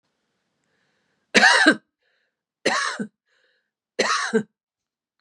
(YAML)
three_cough_length: 5.2 s
three_cough_amplitude: 29469
three_cough_signal_mean_std_ratio: 0.34
survey_phase: beta (2021-08-13 to 2022-03-07)
age: 65+
gender: Female
wearing_mask: 'No'
symptom_none: true
smoker_status: Never smoked
respiratory_condition_asthma: true
respiratory_condition_other: false
recruitment_source: REACT
submission_delay: 1 day
covid_test_result: Negative
covid_test_method: RT-qPCR
influenza_a_test_result: Negative
influenza_b_test_result: Negative